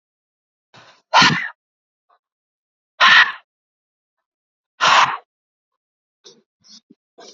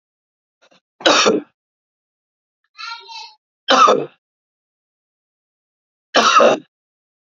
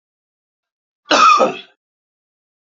{"exhalation_length": "7.3 s", "exhalation_amplitude": 31631, "exhalation_signal_mean_std_ratio": 0.28, "three_cough_length": "7.3 s", "three_cough_amplitude": 31197, "three_cough_signal_mean_std_ratio": 0.33, "cough_length": "2.7 s", "cough_amplitude": 28546, "cough_signal_mean_std_ratio": 0.33, "survey_phase": "beta (2021-08-13 to 2022-03-07)", "age": "18-44", "gender": "Male", "wearing_mask": "No", "symptom_none": true, "smoker_status": "Ex-smoker", "respiratory_condition_asthma": false, "respiratory_condition_other": false, "recruitment_source": "REACT", "submission_delay": "5 days", "covid_test_result": "Negative", "covid_test_method": "RT-qPCR", "influenza_a_test_result": "Negative", "influenza_b_test_result": "Negative"}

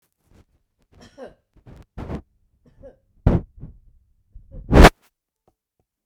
{"three_cough_length": "6.1 s", "three_cough_amplitude": 32768, "three_cough_signal_mean_std_ratio": 0.19, "survey_phase": "beta (2021-08-13 to 2022-03-07)", "age": "65+", "gender": "Female", "wearing_mask": "No", "symptom_none": true, "smoker_status": "Never smoked", "respiratory_condition_asthma": false, "respiratory_condition_other": false, "recruitment_source": "REACT", "submission_delay": "2 days", "covid_test_result": "Negative", "covid_test_method": "RT-qPCR"}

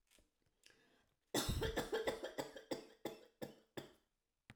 {"cough_length": "4.6 s", "cough_amplitude": 1917, "cough_signal_mean_std_ratio": 0.45, "survey_phase": "alpha (2021-03-01 to 2021-08-12)", "age": "65+", "gender": "Female", "wearing_mask": "No", "symptom_none": true, "smoker_status": "Never smoked", "respiratory_condition_asthma": true, "respiratory_condition_other": false, "recruitment_source": "REACT", "submission_delay": "1 day", "covid_test_result": "Negative", "covid_test_method": "RT-qPCR"}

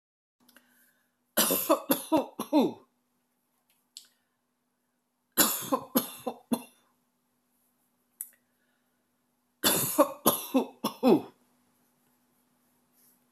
{"three_cough_length": "13.3 s", "three_cough_amplitude": 15123, "three_cough_signal_mean_std_ratio": 0.32, "survey_phase": "beta (2021-08-13 to 2022-03-07)", "age": "65+", "gender": "Female", "wearing_mask": "No", "symptom_none": true, "smoker_status": "Ex-smoker", "respiratory_condition_asthma": false, "respiratory_condition_other": false, "recruitment_source": "REACT", "submission_delay": "1 day", "covid_test_result": "Negative", "covid_test_method": "RT-qPCR"}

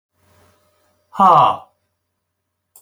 {"exhalation_length": "2.8 s", "exhalation_amplitude": 28319, "exhalation_signal_mean_std_ratio": 0.3, "survey_phase": "alpha (2021-03-01 to 2021-08-12)", "age": "65+", "gender": "Male", "wearing_mask": "No", "symptom_none": true, "smoker_status": "Ex-smoker", "respiratory_condition_asthma": false, "respiratory_condition_other": false, "recruitment_source": "REACT", "submission_delay": "4 days", "covid_test_result": "Negative", "covid_test_method": "RT-qPCR"}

